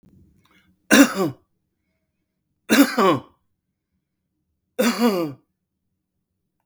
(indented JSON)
{
  "three_cough_length": "6.7 s",
  "three_cough_amplitude": 32766,
  "three_cough_signal_mean_std_ratio": 0.33,
  "survey_phase": "beta (2021-08-13 to 2022-03-07)",
  "age": "65+",
  "gender": "Male",
  "wearing_mask": "No",
  "symptom_none": true,
  "smoker_status": "Ex-smoker",
  "respiratory_condition_asthma": false,
  "respiratory_condition_other": false,
  "recruitment_source": "REACT",
  "submission_delay": "3 days",
  "covid_test_result": "Negative",
  "covid_test_method": "RT-qPCR",
  "influenza_a_test_result": "Negative",
  "influenza_b_test_result": "Negative"
}